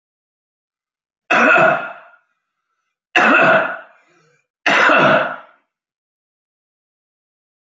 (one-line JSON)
{"three_cough_length": "7.7 s", "three_cough_amplitude": 31290, "three_cough_signal_mean_std_ratio": 0.41, "survey_phase": "alpha (2021-03-01 to 2021-08-12)", "age": "45-64", "gender": "Male", "wearing_mask": "No", "symptom_cough_any": true, "smoker_status": "Ex-smoker", "respiratory_condition_asthma": false, "respiratory_condition_other": false, "recruitment_source": "REACT", "submission_delay": "4 days", "covid_test_result": "Negative", "covid_test_method": "RT-qPCR"}